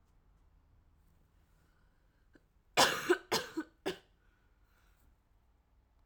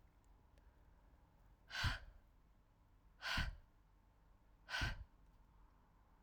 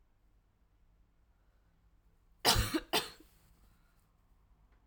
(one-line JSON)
{"three_cough_length": "6.1 s", "three_cough_amplitude": 7111, "three_cough_signal_mean_std_ratio": 0.25, "exhalation_length": "6.2 s", "exhalation_amplitude": 1420, "exhalation_signal_mean_std_ratio": 0.39, "cough_length": "4.9 s", "cough_amplitude": 7240, "cough_signal_mean_std_ratio": 0.26, "survey_phase": "alpha (2021-03-01 to 2021-08-12)", "age": "18-44", "gender": "Female", "wearing_mask": "No", "symptom_cough_any": true, "symptom_shortness_of_breath": true, "symptom_fatigue": true, "symptom_fever_high_temperature": true, "symptom_headache": true, "symptom_onset": "4 days", "smoker_status": "Never smoked", "respiratory_condition_asthma": false, "respiratory_condition_other": false, "recruitment_source": "Test and Trace", "submission_delay": "2 days", "covid_test_result": "Positive", "covid_test_method": "RT-qPCR"}